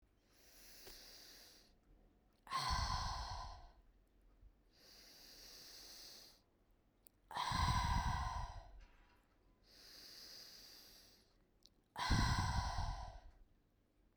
{
  "exhalation_length": "14.2 s",
  "exhalation_amplitude": 2565,
  "exhalation_signal_mean_std_ratio": 0.47,
  "survey_phase": "beta (2021-08-13 to 2022-03-07)",
  "age": "18-44",
  "gender": "Female",
  "wearing_mask": "No",
  "symptom_sore_throat": true,
  "symptom_headache": true,
  "smoker_status": "Never smoked",
  "respiratory_condition_asthma": false,
  "respiratory_condition_other": false,
  "recruitment_source": "REACT",
  "submission_delay": "3 days",
  "covid_test_result": "Negative",
  "covid_test_method": "RT-qPCR"
}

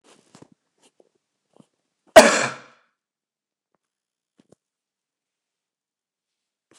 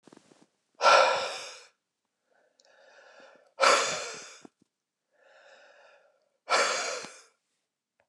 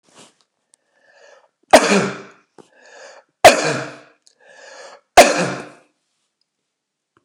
{
  "cough_length": "6.8 s",
  "cough_amplitude": 29204,
  "cough_signal_mean_std_ratio": 0.14,
  "exhalation_length": "8.1 s",
  "exhalation_amplitude": 15357,
  "exhalation_signal_mean_std_ratio": 0.33,
  "three_cough_length": "7.2 s",
  "three_cough_amplitude": 29204,
  "three_cough_signal_mean_std_ratio": 0.27,
  "survey_phase": "beta (2021-08-13 to 2022-03-07)",
  "age": "45-64",
  "gender": "Male",
  "wearing_mask": "No",
  "symptom_none": true,
  "smoker_status": "Never smoked",
  "respiratory_condition_asthma": false,
  "respiratory_condition_other": false,
  "recruitment_source": "REACT",
  "submission_delay": "2 days",
  "covid_test_result": "Negative",
  "covid_test_method": "RT-qPCR"
}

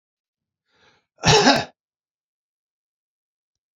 {
  "cough_length": "3.8 s",
  "cough_amplitude": 29256,
  "cough_signal_mean_std_ratio": 0.25,
  "survey_phase": "beta (2021-08-13 to 2022-03-07)",
  "age": "65+",
  "gender": "Male",
  "wearing_mask": "No",
  "symptom_sore_throat": true,
  "smoker_status": "Ex-smoker",
  "respiratory_condition_asthma": false,
  "respiratory_condition_other": false,
  "recruitment_source": "REACT",
  "submission_delay": "3 days",
  "covid_test_result": "Negative",
  "covid_test_method": "RT-qPCR",
  "influenza_a_test_result": "Negative",
  "influenza_b_test_result": "Negative"
}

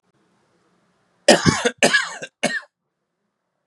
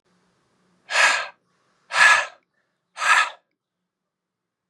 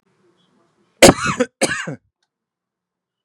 {
  "three_cough_length": "3.7 s",
  "three_cough_amplitude": 32768,
  "three_cough_signal_mean_std_ratio": 0.32,
  "exhalation_length": "4.7 s",
  "exhalation_amplitude": 26975,
  "exhalation_signal_mean_std_ratio": 0.35,
  "cough_length": "3.2 s",
  "cough_amplitude": 32768,
  "cough_signal_mean_std_ratio": 0.26,
  "survey_phase": "beta (2021-08-13 to 2022-03-07)",
  "age": "18-44",
  "gender": "Male",
  "wearing_mask": "No",
  "symptom_cough_any": true,
  "symptom_onset": "13 days",
  "smoker_status": "Never smoked",
  "respiratory_condition_asthma": false,
  "respiratory_condition_other": false,
  "recruitment_source": "REACT",
  "submission_delay": "1 day",
  "covid_test_result": "Negative",
  "covid_test_method": "RT-qPCR",
  "influenza_a_test_result": "Negative",
  "influenza_b_test_result": "Negative"
}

